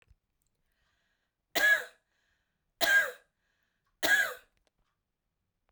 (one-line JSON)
{"three_cough_length": "5.7 s", "three_cough_amplitude": 9704, "three_cough_signal_mean_std_ratio": 0.31, "survey_phase": "beta (2021-08-13 to 2022-03-07)", "age": "18-44", "gender": "Female", "wearing_mask": "No", "symptom_cough_any": true, "symptom_runny_or_blocked_nose": true, "symptom_fatigue": true, "symptom_onset": "13 days", "smoker_status": "Never smoked", "respiratory_condition_asthma": false, "respiratory_condition_other": false, "recruitment_source": "REACT", "submission_delay": "1 day", "covid_test_result": "Negative", "covid_test_method": "RT-qPCR"}